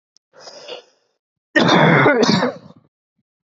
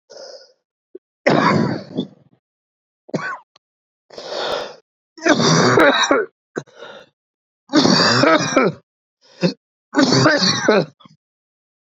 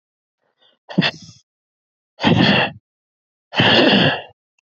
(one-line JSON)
{"cough_length": "3.6 s", "cough_amplitude": 27638, "cough_signal_mean_std_ratio": 0.45, "three_cough_length": "11.9 s", "three_cough_amplitude": 32767, "three_cough_signal_mean_std_ratio": 0.49, "exhalation_length": "4.8 s", "exhalation_amplitude": 27269, "exhalation_signal_mean_std_ratio": 0.43, "survey_phase": "beta (2021-08-13 to 2022-03-07)", "age": "18-44", "gender": "Male", "wearing_mask": "No", "symptom_cough_any": true, "symptom_runny_or_blocked_nose": true, "symptom_sore_throat": true, "symptom_fatigue": true, "symptom_headache": true, "symptom_other": true, "symptom_onset": "3 days", "smoker_status": "Ex-smoker", "respiratory_condition_asthma": false, "respiratory_condition_other": false, "recruitment_source": "Test and Trace", "submission_delay": "1 day", "covid_test_result": "Positive", "covid_test_method": "RT-qPCR", "covid_ct_value": 17.7, "covid_ct_gene": "ORF1ab gene", "covid_ct_mean": 18.1, "covid_viral_load": "1200000 copies/ml", "covid_viral_load_category": "High viral load (>1M copies/ml)"}